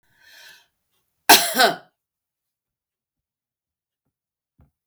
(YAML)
cough_length: 4.9 s
cough_amplitude: 32768
cough_signal_mean_std_ratio: 0.2
survey_phase: beta (2021-08-13 to 2022-03-07)
age: 65+
gender: Female
wearing_mask: 'No'
symptom_none: true
smoker_status: Never smoked
respiratory_condition_asthma: false
respiratory_condition_other: false
recruitment_source: REACT
submission_delay: 4 days
covid_test_result: Negative
covid_test_method: RT-qPCR
influenza_a_test_result: Negative
influenza_b_test_result: Negative